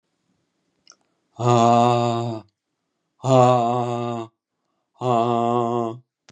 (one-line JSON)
{"exhalation_length": "6.3 s", "exhalation_amplitude": 25201, "exhalation_signal_mean_std_ratio": 0.52, "survey_phase": "beta (2021-08-13 to 2022-03-07)", "age": "45-64", "gender": "Male", "wearing_mask": "No", "symptom_runny_or_blocked_nose": true, "symptom_onset": "5 days", "smoker_status": "Never smoked", "respiratory_condition_asthma": false, "respiratory_condition_other": false, "recruitment_source": "REACT", "submission_delay": "2 days", "covid_test_result": "Negative", "covid_test_method": "RT-qPCR", "influenza_a_test_result": "Negative", "influenza_b_test_result": "Negative"}